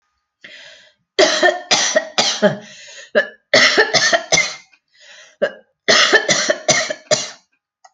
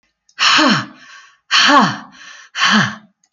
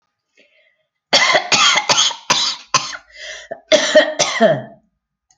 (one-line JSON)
{"three_cough_length": "7.9 s", "three_cough_amplitude": 32767, "three_cough_signal_mean_std_ratio": 0.52, "exhalation_length": "3.3 s", "exhalation_amplitude": 32416, "exhalation_signal_mean_std_ratio": 0.55, "cough_length": "5.4 s", "cough_amplitude": 32767, "cough_signal_mean_std_ratio": 0.52, "survey_phase": "alpha (2021-03-01 to 2021-08-12)", "age": "45-64", "gender": "Female", "wearing_mask": "No", "symptom_none": true, "smoker_status": "Never smoked", "respiratory_condition_asthma": false, "respiratory_condition_other": false, "recruitment_source": "REACT", "submission_delay": "3 days", "covid_test_result": "Negative", "covid_test_method": "RT-qPCR"}